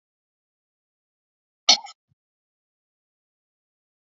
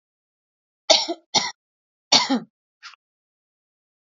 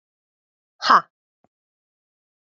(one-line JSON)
{"cough_length": "4.2 s", "cough_amplitude": 28847, "cough_signal_mean_std_ratio": 0.11, "three_cough_length": "4.0 s", "three_cough_amplitude": 32382, "three_cough_signal_mean_std_ratio": 0.27, "exhalation_length": "2.5 s", "exhalation_amplitude": 27875, "exhalation_signal_mean_std_ratio": 0.18, "survey_phase": "beta (2021-08-13 to 2022-03-07)", "age": "18-44", "gender": "Female", "wearing_mask": "No", "symptom_none": true, "smoker_status": "Never smoked", "respiratory_condition_asthma": false, "respiratory_condition_other": false, "recruitment_source": "REACT", "submission_delay": "7 days", "covid_test_result": "Negative", "covid_test_method": "RT-qPCR", "influenza_a_test_result": "Negative", "influenza_b_test_result": "Negative"}